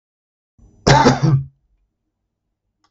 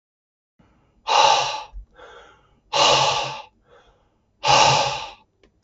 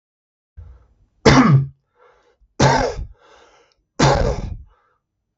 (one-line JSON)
{"cough_length": "2.9 s", "cough_amplitude": 32768, "cough_signal_mean_std_ratio": 0.35, "exhalation_length": "5.6 s", "exhalation_amplitude": 23334, "exhalation_signal_mean_std_ratio": 0.46, "three_cough_length": "5.4 s", "three_cough_amplitude": 32768, "three_cough_signal_mean_std_ratio": 0.4, "survey_phase": "beta (2021-08-13 to 2022-03-07)", "age": "18-44", "gender": "Male", "wearing_mask": "No", "symptom_none": true, "smoker_status": "Never smoked", "respiratory_condition_asthma": false, "respiratory_condition_other": false, "recruitment_source": "REACT", "submission_delay": "2 days", "covid_test_result": "Negative", "covid_test_method": "RT-qPCR"}